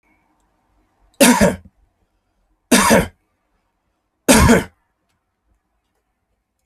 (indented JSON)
{
  "three_cough_length": "6.7 s",
  "three_cough_amplitude": 32768,
  "three_cough_signal_mean_std_ratio": 0.32,
  "survey_phase": "alpha (2021-03-01 to 2021-08-12)",
  "age": "45-64",
  "gender": "Male",
  "wearing_mask": "No",
  "symptom_none": true,
  "smoker_status": "Ex-smoker",
  "respiratory_condition_asthma": true,
  "respiratory_condition_other": false,
  "recruitment_source": "REACT",
  "submission_delay": "1 day",
  "covid_test_result": "Negative",
  "covid_test_method": "RT-qPCR"
}